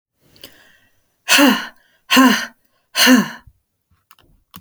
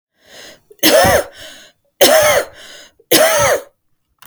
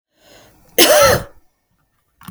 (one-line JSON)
{"exhalation_length": "4.6 s", "exhalation_amplitude": 32768, "exhalation_signal_mean_std_ratio": 0.38, "three_cough_length": "4.3 s", "three_cough_amplitude": 32768, "three_cough_signal_mean_std_ratio": 0.51, "cough_length": "2.3 s", "cough_amplitude": 32768, "cough_signal_mean_std_ratio": 0.37, "survey_phase": "beta (2021-08-13 to 2022-03-07)", "age": "45-64", "gender": "Female", "wearing_mask": "No", "symptom_none": true, "symptom_onset": "12 days", "smoker_status": "Ex-smoker", "respiratory_condition_asthma": false, "respiratory_condition_other": false, "recruitment_source": "REACT", "submission_delay": "1 day", "covid_test_result": "Negative", "covid_test_method": "RT-qPCR", "influenza_a_test_result": "Negative", "influenza_b_test_result": "Negative"}